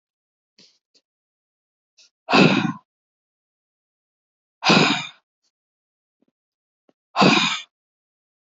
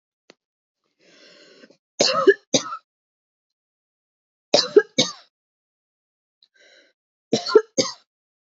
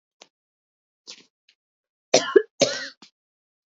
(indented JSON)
{
  "exhalation_length": "8.5 s",
  "exhalation_amplitude": 27353,
  "exhalation_signal_mean_std_ratio": 0.29,
  "three_cough_length": "8.4 s",
  "three_cough_amplitude": 27976,
  "three_cough_signal_mean_std_ratio": 0.24,
  "cough_length": "3.7 s",
  "cough_amplitude": 27337,
  "cough_signal_mean_std_ratio": 0.21,
  "survey_phase": "beta (2021-08-13 to 2022-03-07)",
  "age": "18-44",
  "gender": "Female",
  "wearing_mask": "No",
  "symptom_sore_throat": true,
  "symptom_fatigue": true,
  "symptom_change_to_sense_of_smell_or_taste": true,
  "symptom_onset": "12 days",
  "smoker_status": "Never smoked",
  "respiratory_condition_asthma": false,
  "respiratory_condition_other": false,
  "recruitment_source": "REACT",
  "submission_delay": "2 days",
  "covid_test_result": "Negative",
  "covid_test_method": "RT-qPCR",
  "influenza_a_test_result": "Negative",
  "influenza_b_test_result": "Negative"
}